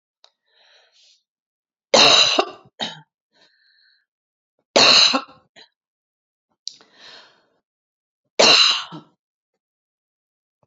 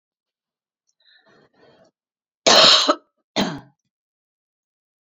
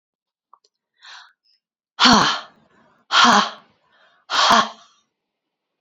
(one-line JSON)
{"three_cough_length": "10.7 s", "three_cough_amplitude": 31464, "three_cough_signal_mean_std_ratio": 0.29, "cough_length": "5.0 s", "cough_amplitude": 31722, "cough_signal_mean_std_ratio": 0.27, "exhalation_length": "5.8 s", "exhalation_amplitude": 30008, "exhalation_signal_mean_std_ratio": 0.35, "survey_phase": "beta (2021-08-13 to 2022-03-07)", "age": "65+", "gender": "Female", "wearing_mask": "No", "symptom_none": true, "smoker_status": "Never smoked", "respiratory_condition_asthma": false, "respiratory_condition_other": false, "recruitment_source": "REACT", "submission_delay": "2 days", "covid_test_result": "Negative", "covid_test_method": "RT-qPCR", "influenza_a_test_result": "Negative", "influenza_b_test_result": "Negative"}